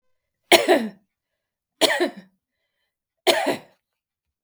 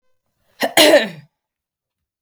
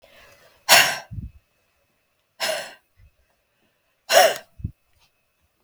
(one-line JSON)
{"three_cough_length": "4.4 s", "three_cough_amplitude": 32768, "three_cough_signal_mean_std_ratio": 0.32, "cough_length": "2.2 s", "cough_amplitude": 32768, "cough_signal_mean_std_ratio": 0.32, "exhalation_length": "5.6 s", "exhalation_amplitude": 32768, "exhalation_signal_mean_std_ratio": 0.28, "survey_phase": "beta (2021-08-13 to 2022-03-07)", "age": "45-64", "gender": "Female", "wearing_mask": "No", "symptom_none": true, "smoker_status": "Never smoked", "respiratory_condition_asthma": false, "respiratory_condition_other": false, "recruitment_source": "REACT", "submission_delay": "1 day", "covid_test_result": "Negative", "covid_test_method": "RT-qPCR", "influenza_a_test_result": "Negative", "influenza_b_test_result": "Negative"}